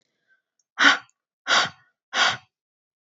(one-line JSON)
{"exhalation_length": "3.2 s", "exhalation_amplitude": 25877, "exhalation_signal_mean_std_ratio": 0.33, "survey_phase": "beta (2021-08-13 to 2022-03-07)", "age": "18-44", "gender": "Female", "wearing_mask": "No", "symptom_none": true, "smoker_status": "Never smoked", "respiratory_condition_asthma": false, "respiratory_condition_other": false, "recruitment_source": "REACT", "submission_delay": "1 day", "covid_test_result": "Negative", "covid_test_method": "RT-qPCR", "influenza_a_test_result": "Negative", "influenza_b_test_result": "Negative"}